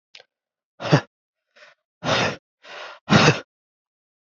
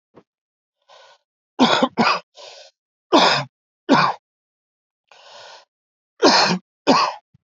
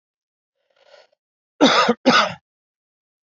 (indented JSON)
{
  "exhalation_length": "4.4 s",
  "exhalation_amplitude": 27550,
  "exhalation_signal_mean_std_ratio": 0.32,
  "three_cough_length": "7.6 s",
  "three_cough_amplitude": 30747,
  "three_cough_signal_mean_std_ratio": 0.38,
  "cough_length": "3.2 s",
  "cough_amplitude": 26415,
  "cough_signal_mean_std_ratio": 0.33,
  "survey_phase": "alpha (2021-03-01 to 2021-08-12)",
  "age": "18-44",
  "gender": "Male",
  "wearing_mask": "No",
  "symptom_cough_any": true,
  "symptom_fatigue": true,
  "symptom_fever_high_temperature": true,
  "symptom_headache": true,
  "symptom_change_to_sense_of_smell_or_taste": true,
  "symptom_loss_of_taste": true,
  "smoker_status": "Ex-smoker",
  "respiratory_condition_asthma": false,
  "respiratory_condition_other": false,
  "recruitment_source": "Test and Trace",
  "submission_delay": "0 days",
  "covid_test_result": "Positive",
  "covid_test_method": "LFT"
}